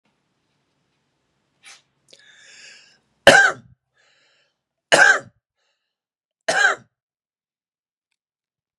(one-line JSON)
{"three_cough_length": "8.8 s", "three_cough_amplitude": 32768, "three_cough_signal_mean_std_ratio": 0.23, "survey_phase": "beta (2021-08-13 to 2022-03-07)", "age": "45-64", "gender": "Male", "wearing_mask": "No", "symptom_none": true, "smoker_status": "Ex-smoker", "respiratory_condition_asthma": false, "respiratory_condition_other": false, "recruitment_source": "Test and Trace", "submission_delay": "0 days", "covid_test_result": "Negative", "covid_test_method": "LFT"}